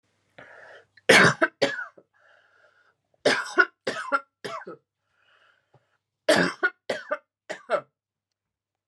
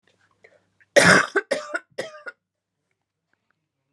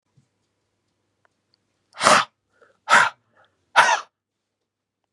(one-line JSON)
{"three_cough_length": "8.9 s", "three_cough_amplitude": 26025, "three_cough_signal_mean_std_ratio": 0.31, "cough_length": "3.9 s", "cough_amplitude": 31752, "cough_signal_mean_std_ratio": 0.28, "exhalation_length": "5.1 s", "exhalation_amplitude": 32768, "exhalation_signal_mean_std_ratio": 0.27, "survey_phase": "beta (2021-08-13 to 2022-03-07)", "age": "45-64", "gender": "Female", "wearing_mask": "Yes", "symptom_cough_any": true, "symptom_new_continuous_cough": true, "symptom_runny_or_blocked_nose": true, "symptom_change_to_sense_of_smell_or_taste": true, "symptom_loss_of_taste": true, "symptom_onset": "5 days", "smoker_status": "Never smoked", "respiratory_condition_asthma": false, "respiratory_condition_other": false, "recruitment_source": "Test and Trace", "submission_delay": "2 days", "covid_test_result": "Positive", "covid_test_method": "RT-qPCR", "covid_ct_value": 20.4, "covid_ct_gene": "N gene"}